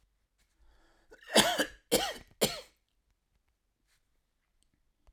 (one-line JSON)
{"cough_length": "5.1 s", "cough_amplitude": 12184, "cough_signal_mean_std_ratio": 0.27, "survey_phase": "alpha (2021-03-01 to 2021-08-12)", "age": "65+", "gender": "Male", "wearing_mask": "No", "symptom_none": true, "smoker_status": "Never smoked", "respiratory_condition_asthma": false, "respiratory_condition_other": false, "recruitment_source": "REACT", "submission_delay": "3 days", "covid_test_result": "Negative", "covid_test_method": "RT-qPCR"}